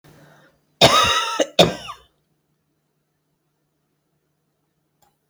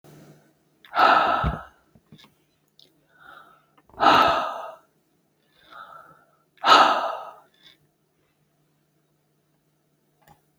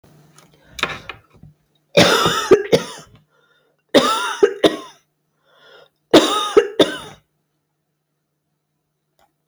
{"cough_length": "5.3 s", "cough_amplitude": 29683, "cough_signal_mean_std_ratio": 0.28, "exhalation_length": "10.6 s", "exhalation_amplitude": 26706, "exhalation_signal_mean_std_ratio": 0.32, "three_cough_length": "9.5 s", "three_cough_amplitude": 31379, "three_cough_signal_mean_std_ratio": 0.35, "survey_phase": "beta (2021-08-13 to 2022-03-07)", "age": "65+", "gender": "Female", "wearing_mask": "No", "symptom_none": true, "smoker_status": "Never smoked", "respiratory_condition_asthma": false, "respiratory_condition_other": false, "recruitment_source": "REACT", "submission_delay": "2 days", "covid_test_result": "Negative", "covid_test_method": "RT-qPCR"}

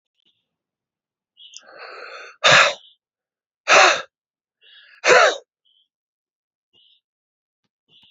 {"exhalation_length": "8.1 s", "exhalation_amplitude": 29867, "exhalation_signal_mean_std_ratio": 0.27, "survey_phase": "beta (2021-08-13 to 2022-03-07)", "age": "18-44", "gender": "Male", "wearing_mask": "No", "symptom_cough_any": true, "symptom_runny_or_blocked_nose": true, "symptom_fatigue": true, "symptom_headache": true, "symptom_onset": "3 days", "smoker_status": "Ex-smoker", "respiratory_condition_asthma": false, "respiratory_condition_other": false, "recruitment_source": "Test and Trace", "submission_delay": "1 day", "covid_test_result": "Positive", "covid_test_method": "RT-qPCR", "covid_ct_value": 17.1, "covid_ct_gene": "ORF1ab gene", "covid_ct_mean": 17.4, "covid_viral_load": "1900000 copies/ml", "covid_viral_load_category": "High viral load (>1M copies/ml)"}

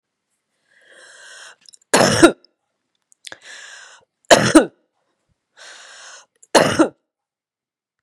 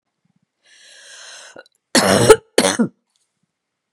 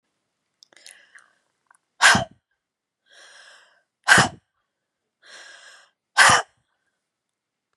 {"three_cough_length": "8.0 s", "three_cough_amplitude": 32768, "three_cough_signal_mean_std_ratio": 0.27, "cough_length": "3.9 s", "cough_amplitude": 32768, "cough_signal_mean_std_ratio": 0.31, "exhalation_length": "7.8 s", "exhalation_amplitude": 32321, "exhalation_signal_mean_std_ratio": 0.23, "survey_phase": "beta (2021-08-13 to 2022-03-07)", "age": "45-64", "gender": "Female", "wearing_mask": "No", "symptom_none": true, "smoker_status": "Never smoked", "respiratory_condition_asthma": false, "respiratory_condition_other": false, "recruitment_source": "REACT", "submission_delay": "1 day", "covid_test_result": "Negative", "covid_test_method": "RT-qPCR", "influenza_a_test_result": "Negative", "influenza_b_test_result": "Negative"}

